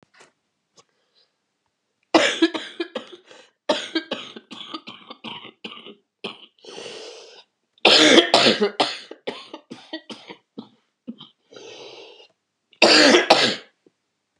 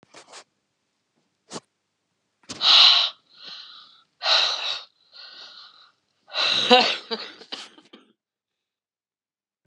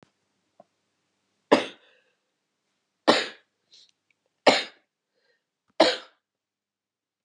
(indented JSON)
{
  "cough_length": "14.4 s",
  "cough_amplitude": 32768,
  "cough_signal_mean_std_ratio": 0.34,
  "exhalation_length": "9.7 s",
  "exhalation_amplitude": 29901,
  "exhalation_signal_mean_std_ratio": 0.33,
  "three_cough_length": "7.2 s",
  "three_cough_amplitude": 28274,
  "three_cough_signal_mean_std_ratio": 0.21,
  "survey_phase": "beta (2021-08-13 to 2022-03-07)",
  "age": "65+",
  "gender": "Female",
  "wearing_mask": "No",
  "symptom_cough_any": true,
  "symptom_new_continuous_cough": true,
  "symptom_runny_or_blocked_nose": true,
  "symptom_shortness_of_breath": true,
  "symptom_sore_throat": true,
  "symptom_fever_high_temperature": true,
  "symptom_headache": true,
  "symptom_change_to_sense_of_smell_or_taste": true,
  "symptom_onset": "4 days",
  "smoker_status": "Never smoked",
  "respiratory_condition_asthma": false,
  "respiratory_condition_other": false,
  "recruitment_source": "Test and Trace",
  "submission_delay": "1 day",
  "covid_test_result": "Negative",
  "covid_test_method": "ePCR"
}